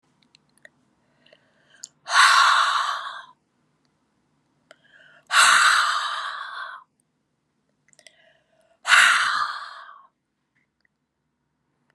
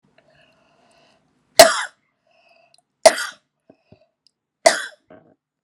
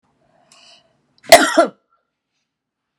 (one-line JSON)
{"exhalation_length": "11.9 s", "exhalation_amplitude": 25709, "exhalation_signal_mean_std_ratio": 0.38, "three_cough_length": "5.6 s", "three_cough_amplitude": 32768, "three_cough_signal_mean_std_ratio": 0.19, "cough_length": "3.0 s", "cough_amplitude": 32768, "cough_signal_mean_std_ratio": 0.23, "survey_phase": "beta (2021-08-13 to 2022-03-07)", "age": "65+", "gender": "Female", "wearing_mask": "No", "symptom_none": true, "smoker_status": "Never smoked", "respiratory_condition_asthma": false, "respiratory_condition_other": false, "recruitment_source": "REACT", "submission_delay": "13 days", "covid_test_result": "Negative", "covid_test_method": "RT-qPCR"}